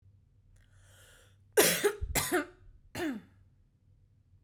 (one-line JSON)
{"cough_length": "4.4 s", "cough_amplitude": 11052, "cough_signal_mean_std_ratio": 0.37, "survey_phase": "beta (2021-08-13 to 2022-03-07)", "age": "18-44", "gender": "Female", "wearing_mask": "No", "symptom_none": true, "smoker_status": "Never smoked", "respiratory_condition_asthma": false, "respiratory_condition_other": false, "recruitment_source": "REACT", "submission_delay": "0 days", "covid_test_result": "Negative", "covid_test_method": "RT-qPCR"}